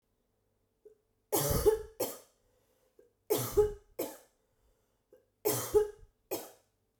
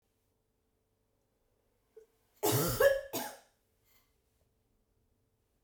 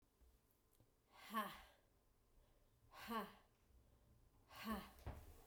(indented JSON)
{
  "three_cough_length": "7.0 s",
  "three_cough_amplitude": 6337,
  "three_cough_signal_mean_std_ratio": 0.36,
  "cough_length": "5.6 s",
  "cough_amplitude": 6779,
  "cough_signal_mean_std_ratio": 0.28,
  "exhalation_length": "5.5 s",
  "exhalation_amplitude": 764,
  "exhalation_signal_mean_std_ratio": 0.43,
  "survey_phase": "beta (2021-08-13 to 2022-03-07)",
  "age": "18-44",
  "gender": "Female",
  "wearing_mask": "No",
  "symptom_runny_or_blocked_nose": true,
  "smoker_status": "Never smoked",
  "respiratory_condition_asthma": false,
  "respiratory_condition_other": false,
  "recruitment_source": "Test and Trace",
  "submission_delay": "2 days",
  "covid_test_result": "Positive",
  "covid_test_method": "RT-qPCR",
  "covid_ct_value": 31.1,
  "covid_ct_gene": "ORF1ab gene",
  "covid_ct_mean": 32.8,
  "covid_viral_load": "17 copies/ml",
  "covid_viral_load_category": "Minimal viral load (< 10K copies/ml)"
}